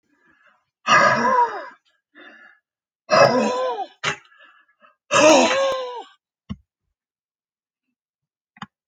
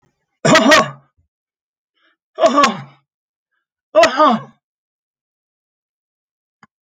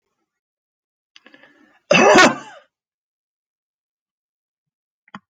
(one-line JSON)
{"exhalation_length": "8.9 s", "exhalation_amplitude": 26384, "exhalation_signal_mean_std_ratio": 0.41, "three_cough_length": "6.8 s", "three_cough_amplitude": 32567, "three_cough_signal_mean_std_ratio": 0.34, "cough_length": "5.3 s", "cough_amplitude": 31179, "cough_signal_mean_std_ratio": 0.24, "survey_phase": "alpha (2021-03-01 to 2021-08-12)", "age": "65+", "gender": "Male", "wearing_mask": "No", "symptom_cough_any": true, "smoker_status": "Ex-smoker", "respiratory_condition_asthma": false, "respiratory_condition_other": false, "recruitment_source": "REACT", "submission_delay": "2 days", "covid_test_result": "Negative", "covid_test_method": "RT-qPCR"}